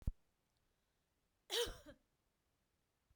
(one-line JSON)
{"cough_length": "3.2 s", "cough_amplitude": 1808, "cough_signal_mean_std_ratio": 0.24, "survey_phase": "beta (2021-08-13 to 2022-03-07)", "age": "45-64", "gender": "Female", "wearing_mask": "No", "symptom_none": true, "smoker_status": "Never smoked", "respiratory_condition_asthma": false, "respiratory_condition_other": false, "recruitment_source": "REACT", "submission_delay": "1 day", "covid_test_result": "Negative", "covid_test_method": "RT-qPCR"}